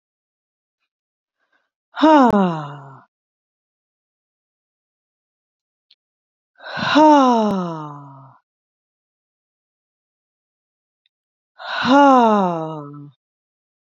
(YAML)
exhalation_length: 13.9 s
exhalation_amplitude: 27884
exhalation_signal_mean_std_ratio: 0.33
survey_phase: beta (2021-08-13 to 2022-03-07)
age: 18-44
gender: Female
wearing_mask: 'No'
symptom_cough_any: true
smoker_status: Never smoked
respiratory_condition_asthma: false
respiratory_condition_other: false
recruitment_source: REACT
submission_delay: 2 days
covid_test_result: Negative
covid_test_method: RT-qPCR
influenza_a_test_result: Unknown/Void
influenza_b_test_result: Unknown/Void